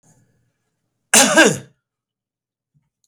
cough_length: 3.1 s
cough_amplitude: 32768
cough_signal_mean_std_ratio: 0.29
survey_phase: beta (2021-08-13 to 2022-03-07)
age: 45-64
gender: Male
wearing_mask: 'No'
symptom_none: true
smoker_status: Ex-smoker
respiratory_condition_asthma: false
respiratory_condition_other: false
recruitment_source: REACT
submission_delay: 22 days
covid_test_result: Negative
covid_test_method: RT-qPCR
influenza_a_test_result: Negative
influenza_b_test_result: Negative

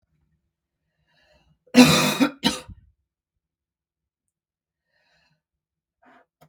cough_length: 6.5 s
cough_amplitude: 32766
cough_signal_mean_std_ratio: 0.22
survey_phase: beta (2021-08-13 to 2022-03-07)
age: 18-44
gender: Female
wearing_mask: 'No'
symptom_cough_any: true
symptom_runny_or_blocked_nose: true
symptom_sore_throat: true
symptom_diarrhoea: true
symptom_fatigue: true
symptom_headache: true
symptom_onset: 1 day
smoker_status: Ex-smoker
respiratory_condition_asthma: false
respiratory_condition_other: false
recruitment_source: Test and Trace
submission_delay: 1 day
covid_test_result: Positive
covid_test_method: RT-qPCR
covid_ct_value: 21.4
covid_ct_gene: N gene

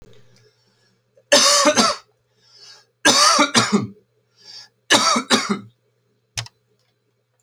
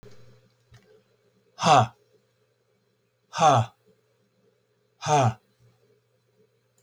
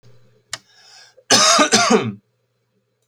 three_cough_length: 7.4 s
three_cough_amplitude: 31240
three_cough_signal_mean_std_ratio: 0.42
exhalation_length: 6.8 s
exhalation_amplitude: 19029
exhalation_signal_mean_std_ratio: 0.29
cough_length: 3.1 s
cough_amplitude: 32768
cough_signal_mean_std_ratio: 0.42
survey_phase: beta (2021-08-13 to 2022-03-07)
age: 45-64
gender: Male
wearing_mask: 'No'
symptom_none: true
smoker_status: Never smoked
respiratory_condition_asthma: false
respiratory_condition_other: false
recruitment_source: REACT
submission_delay: 4 days
covid_test_result: Negative
covid_test_method: RT-qPCR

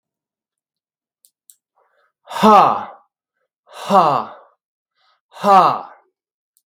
exhalation_length: 6.7 s
exhalation_amplitude: 32768
exhalation_signal_mean_std_ratio: 0.32
survey_phase: beta (2021-08-13 to 2022-03-07)
age: 65+
gender: Male
wearing_mask: 'No'
symptom_none: true
smoker_status: Never smoked
respiratory_condition_asthma: true
respiratory_condition_other: false
recruitment_source: REACT
submission_delay: 3 days
covid_test_result: Negative
covid_test_method: RT-qPCR
influenza_a_test_result: Negative
influenza_b_test_result: Negative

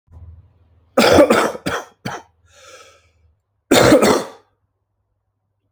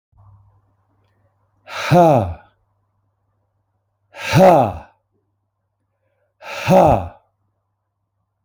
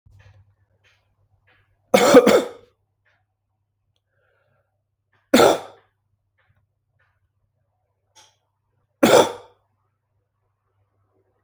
cough_length: 5.7 s
cough_amplitude: 32768
cough_signal_mean_std_ratio: 0.38
exhalation_length: 8.4 s
exhalation_amplitude: 29575
exhalation_signal_mean_std_ratio: 0.32
three_cough_length: 11.4 s
three_cough_amplitude: 29322
three_cough_signal_mean_std_ratio: 0.23
survey_phase: alpha (2021-03-01 to 2021-08-12)
age: 18-44
gender: Male
wearing_mask: 'No'
symptom_cough_any: true
symptom_fatigue: true
symptom_fever_high_temperature: true
symptom_headache: true
symptom_onset: 3 days
smoker_status: Never smoked
respiratory_condition_asthma: false
respiratory_condition_other: false
recruitment_source: Test and Trace
submission_delay: 1 day
covid_test_result: Positive
covid_test_method: RT-qPCR
covid_ct_value: 32.6
covid_ct_gene: N gene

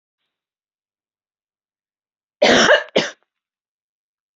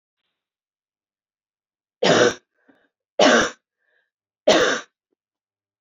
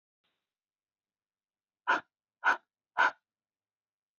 cough_length: 4.4 s
cough_amplitude: 27511
cough_signal_mean_std_ratio: 0.27
three_cough_length: 5.8 s
three_cough_amplitude: 25114
three_cough_signal_mean_std_ratio: 0.31
exhalation_length: 4.2 s
exhalation_amplitude: 6898
exhalation_signal_mean_std_ratio: 0.22
survey_phase: beta (2021-08-13 to 2022-03-07)
age: 45-64
gender: Female
wearing_mask: 'No'
symptom_none: true
smoker_status: Never smoked
respiratory_condition_asthma: false
respiratory_condition_other: false
recruitment_source: REACT
submission_delay: 1 day
covid_test_result: Negative
covid_test_method: RT-qPCR
influenza_a_test_result: Negative
influenza_b_test_result: Negative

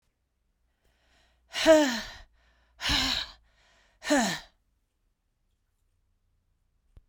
exhalation_length: 7.1 s
exhalation_amplitude: 13824
exhalation_signal_mean_std_ratio: 0.31
survey_phase: beta (2021-08-13 to 2022-03-07)
age: 45-64
gender: Female
wearing_mask: 'No'
symptom_cough_any: true
symptom_fatigue: true
smoker_status: Never smoked
respiratory_condition_asthma: false
respiratory_condition_other: false
recruitment_source: Test and Trace
submission_delay: 2 days
covid_test_result: Positive
covid_test_method: RT-qPCR
covid_ct_value: 31.4
covid_ct_gene: ORF1ab gene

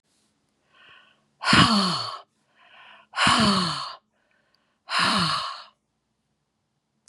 exhalation_length: 7.1 s
exhalation_amplitude: 24870
exhalation_signal_mean_std_ratio: 0.43
survey_phase: beta (2021-08-13 to 2022-03-07)
age: 65+
gender: Female
wearing_mask: 'No'
symptom_none: true
smoker_status: Ex-smoker
respiratory_condition_asthma: false
respiratory_condition_other: false
recruitment_source: REACT
submission_delay: 4 days
covid_test_result: Negative
covid_test_method: RT-qPCR
influenza_a_test_result: Negative
influenza_b_test_result: Negative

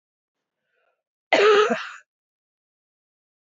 cough_length: 3.5 s
cough_amplitude: 19948
cough_signal_mean_std_ratio: 0.31
survey_phase: beta (2021-08-13 to 2022-03-07)
age: 45-64
gender: Female
wearing_mask: 'No'
symptom_cough_any: true
symptom_runny_or_blocked_nose: true
smoker_status: Ex-smoker
respiratory_condition_asthma: false
respiratory_condition_other: false
recruitment_source: REACT
submission_delay: 3 days
covid_test_result: Negative
covid_test_method: RT-qPCR
influenza_a_test_result: Negative
influenza_b_test_result: Negative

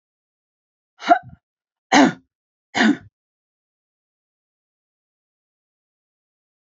cough_length: 6.7 s
cough_amplitude: 28321
cough_signal_mean_std_ratio: 0.21
survey_phase: alpha (2021-03-01 to 2021-08-12)
age: 65+
gender: Female
wearing_mask: 'No'
symptom_none: true
smoker_status: Never smoked
respiratory_condition_asthma: false
respiratory_condition_other: false
recruitment_source: REACT
submission_delay: 2 days
covid_test_result: Negative
covid_test_method: RT-qPCR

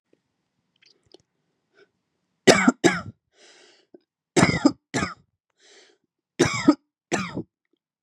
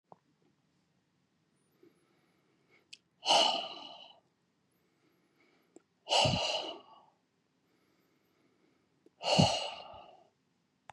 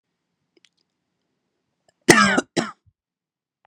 three_cough_length: 8.0 s
three_cough_amplitude: 32767
three_cough_signal_mean_std_ratio: 0.28
exhalation_length: 10.9 s
exhalation_amplitude: 9144
exhalation_signal_mean_std_ratio: 0.3
cough_length: 3.7 s
cough_amplitude: 32768
cough_signal_mean_std_ratio: 0.24
survey_phase: beta (2021-08-13 to 2022-03-07)
age: 18-44
gender: Male
wearing_mask: 'No'
symptom_sore_throat: true
symptom_onset: 6 days
smoker_status: Ex-smoker
respiratory_condition_asthma: false
respiratory_condition_other: false
recruitment_source: REACT
submission_delay: 1 day
covid_test_result: Positive
covid_test_method: RT-qPCR
covid_ct_value: 35.4
covid_ct_gene: N gene
influenza_a_test_result: Negative
influenza_b_test_result: Negative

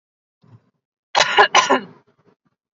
cough_length: 2.7 s
cough_amplitude: 32768
cough_signal_mean_std_ratio: 0.33
survey_phase: alpha (2021-03-01 to 2021-08-12)
age: 18-44
gender: Female
wearing_mask: 'No'
symptom_none: true
smoker_status: Never smoked
respiratory_condition_asthma: false
respiratory_condition_other: false
recruitment_source: REACT
submission_delay: 2 days
covid_test_result: Negative
covid_test_method: RT-qPCR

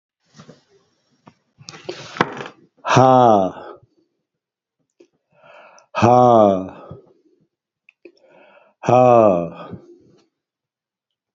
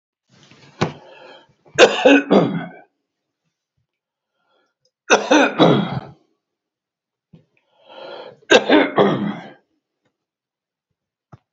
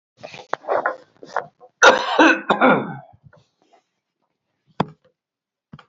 exhalation_length: 11.3 s
exhalation_amplitude: 28397
exhalation_signal_mean_std_ratio: 0.34
three_cough_length: 11.5 s
three_cough_amplitude: 30798
three_cough_signal_mean_std_ratio: 0.34
cough_length: 5.9 s
cough_amplitude: 30636
cough_signal_mean_std_ratio: 0.34
survey_phase: beta (2021-08-13 to 2022-03-07)
age: 65+
gender: Male
wearing_mask: 'No'
symptom_cough_any: true
smoker_status: Ex-smoker
respiratory_condition_asthma: false
respiratory_condition_other: true
recruitment_source: REACT
submission_delay: 2 days
covid_test_result: Negative
covid_test_method: RT-qPCR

